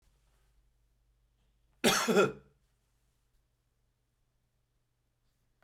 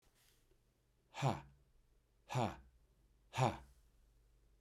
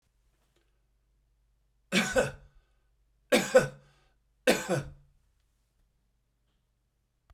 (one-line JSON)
{"cough_length": "5.6 s", "cough_amplitude": 8069, "cough_signal_mean_std_ratio": 0.23, "exhalation_length": "4.6 s", "exhalation_amplitude": 3113, "exhalation_signal_mean_std_ratio": 0.32, "three_cough_length": "7.3 s", "three_cough_amplitude": 13346, "three_cough_signal_mean_std_ratio": 0.26, "survey_phase": "beta (2021-08-13 to 2022-03-07)", "age": "45-64", "gender": "Male", "wearing_mask": "No", "symptom_cough_any": true, "symptom_headache": true, "symptom_onset": "12 days", "smoker_status": "Never smoked", "respiratory_condition_asthma": false, "respiratory_condition_other": false, "recruitment_source": "REACT", "submission_delay": "2 days", "covid_test_result": "Negative", "covid_test_method": "RT-qPCR", "influenza_a_test_result": "Negative", "influenza_b_test_result": "Negative"}